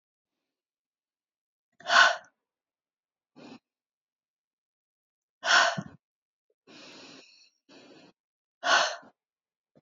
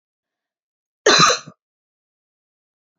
exhalation_length: 9.8 s
exhalation_amplitude: 16155
exhalation_signal_mean_std_ratio: 0.24
cough_length: 3.0 s
cough_amplitude: 29214
cough_signal_mean_std_ratio: 0.26
survey_phase: beta (2021-08-13 to 2022-03-07)
age: 45-64
gender: Female
wearing_mask: 'No'
symptom_headache: true
smoker_status: Never smoked
respiratory_condition_asthma: false
respiratory_condition_other: false
recruitment_source: REACT
submission_delay: 0 days
covid_test_result: Negative
covid_test_method: RT-qPCR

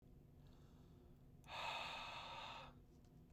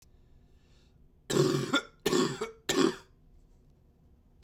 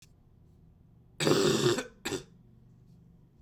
exhalation_length: 3.3 s
exhalation_amplitude: 532
exhalation_signal_mean_std_ratio: 0.75
three_cough_length: 4.4 s
three_cough_amplitude: 8496
three_cough_signal_mean_std_ratio: 0.42
cough_length: 3.4 s
cough_amplitude: 8818
cough_signal_mean_std_ratio: 0.41
survey_phase: beta (2021-08-13 to 2022-03-07)
age: 18-44
gender: Male
wearing_mask: 'No'
symptom_cough_any: true
symptom_new_continuous_cough: true
symptom_runny_or_blocked_nose: true
symptom_sore_throat: true
symptom_fatigue: true
symptom_headache: true
symptom_onset: 3 days
smoker_status: Never smoked
respiratory_condition_asthma: false
respiratory_condition_other: false
recruitment_source: Test and Trace
submission_delay: 0 days
covid_test_result: Positive
covid_test_method: RT-qPCR
covid_ct_value: 14.8
covid_ct_gene: ORF1ab gene
covid_ct_mean: 14.8
covid_viral_load: 14000000 copies/ml
covid_viral_load_category: High viral load (>1M copies/ml)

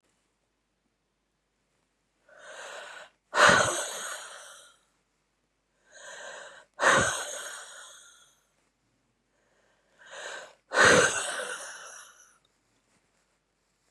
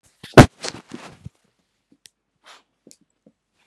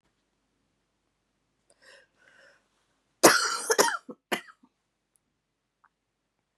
exhalation_length: 13.9 s
exhalation_amplitude: 16306
exhalation_signal_mean_std_ratio: 0.31
three_cough_length: 3.7 s
three_cough_amplitude: 32768
three_cough_signal_mean_std_ratio: 0.14
cough_length: 6.6 s
cough_amplitude: 30500
cough_signal_mean_std_ratio: 0.22
survey_phase: beta (2021-08-13 to 2022-03-07)
age: 18-44
gender: Female
wearing_mask: 'No'
symptom_new_continuous_cough: true
symptom_runny_or_blocked_nose: true
symptom_sore_throat: true
symptom_fatigue: true
symptom_headache: true
symptom_onset: 4 days
smoker_status: Current smoker (e-cigarettes or vapes only)
respiratory_condition_asthma: false
respiratory_condition_other: false
recruitment_source: Test and Trace
submission_delay: 2 days
covid_test_result: Positive
covid_test_method: RT-qPCR
covid_ct_value: 33.7
covid_ct_gene: N gene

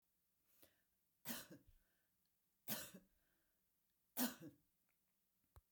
three_cough_length: 5.7 s
three_cough_amplitude: 1213
three_cough_signal_mean_std_ratio: 0.27
survey_phase: beta (2021-08-13 to 2022-03-07)
age: 65+
gender: Female
wearing_mask: 'No'
symptom_none: true
smoker_status: Never smoked
respiratory_condition_asthma: false
respiratory_condition_other: false
recruitment_source: REACT
submission_delay: 1 day
covid_test_result: Negative
covid_test_method: RT-qPCR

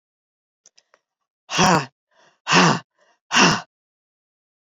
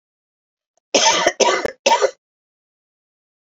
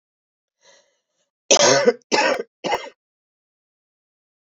exhalation_length: 4.7 s
exhalation_amplitude: 29377
exhalation_signal_mean_std_ratio: 0.34
cough_length: 3.5 s
cough_amplitude: 29496
cough_signal_mean_std_ratio: 0.39
three_cough_length: 4.5 s
three_cough_amplitude: 32103
three_cough_signal_mean_std_ratio: 0.33
survey_phase: beta (2021-08-13 to 2022-03-07)
age: 65+
gender: Female
wearing_mask: 'No'
symptom_cough_any: true
symptom_runny_or_blocked_nose: true
symptom_fatigue: true
symptom_other: true
symptom_onset: 2 days
smoker_status: Never smoked
respiratory_condition_asthma: false
respiratory_condition_other: false
recruitment_source: Test and Trace
submission_delay: 1 day
covid_test_result: Positive
covid_test_method: RT-qPCR
covid_ct_value: 19.3
covid_ct_gene: N gene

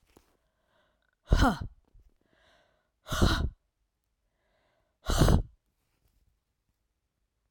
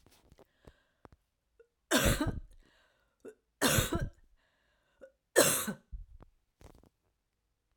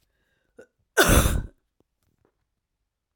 exhalation_length: 7.5 s
exhalation_amplitude: 13416
exhalation_signal_mean_std_ratio: 0.29
three_cough_length: 7.8 s
three_cough_amplitude: 12614
three_cough_signal_mean_std_ratio: 0.32
cough_length: 3.2 s
cough_amplitude: 23380
cough_signal_mean_std_ratio: 0.29
survey_phase: beta (2021-08-13 to 2022-03-07)
age: 45-64
gender: Female
wearing_mask: 'No'
symptom_runny_or_blocked_nose: true
symptom_change_to_sense_of_smell_or_taste: true
symptom_loss_of_taste: true
symptom_onset: 3 days
smoker_status: Never smoked
respiratory_condition_asthma: true
respiratory_condition_other: false
recruitment_source: Test and Trace
submission_delay: 2 days
covid_test_result: Positive
covid_test_method: RT-qPCR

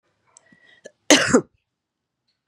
cough_length: 2.5 s
cough_amplitude: 32768
cough_signal_mean_std_ratio: 0.25
survey_phase: beta (2021-08-13 to 2022-03-07)
age: 65+
gender: Female
wearing_mask: 'No'
symptom_cough_any: true
symptom_runny_or_blocked_nose: true
symptom_sore_throat: true
symptom_fatigue: true
smoker_status: Ex-smoker
respiratory_condition_asthma: false
respiratory_condition_other: false
recruitment_source: REACT
submission_delay: 2 days
covid_test_result: Positive
covid_test_method: RT-qPCR
covid_ct_value: 22.0
covid_ct_gene: E gene
influenza_a_test_result: Negative
influenza_b_test_result: Negative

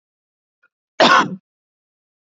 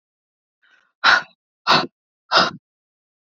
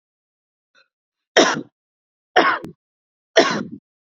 cough_length: 2.2 s
cough_amplitude: 29042
cough_signal_mean_std_ratio: 0.29
exhalation_length: 3.2 s
exhalation_amplitude: 28249
exhalation_signal_mean_std_ratio: 0.32
three_cough_length: 4.2 s
three_cough_amplitude: 30316
three_cough_signal_mean_std_ratio: 0.31
survey_phase: beta (2021-08-13 to 2022-03-07)
age: 18-44
gender: Female
wearing_mask: 'No'
symptom_none: true
smoker_status: Never smoked
respiratory_condition_asthma: false
respiratory_condition_other: false
recruitment_source: REACT
submission_delay: 1 day
covid_test_result: Negative
covid_test_method: RT-qPCR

